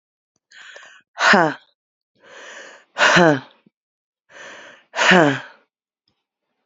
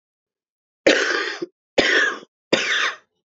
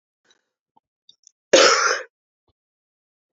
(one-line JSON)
{"exhalation_length": "6.7 s", "exhalation_amplitude": 29438, "exhalation_signal_mean_std_ratio": 0.33, "three_cough_length": "3.2 s", "three_cough_amplitude": 27539, "three_cough_signal_mean_std_ratio": 0.5, "cough_length": "3.3 s", "cough_amplitude": 31833, "cough_signal_mean_std_ratio": 0.28, "survey_phase": "beta (2021-08-13 to 2022-03-07)", "age": "18-44", "gender": "Female", "wearing_mask": "No", "symptom_cough_any": true, "symptom_runny_or_blocked_nose": true, "symptom_shortness_of_breath": true, "symptom_sore_throat": true, "symptom_fever_high_temperature": true, "symptom_headache": true, "symptom_change_to_sense_of_smell_or_taste": true, "symptom_other": true, "symptom_onset": "6 days", "smoker_status": "Current smoker (1 to 10 cigarettes per day)", "respiratory_condition_asthma": true, "respiratory_condition_other": false, "recruitment_source": "Test and Trace", "submission_delay": "2 days", "covid_test_result": "Positive", "covid_test_method": "RT-qPCR"}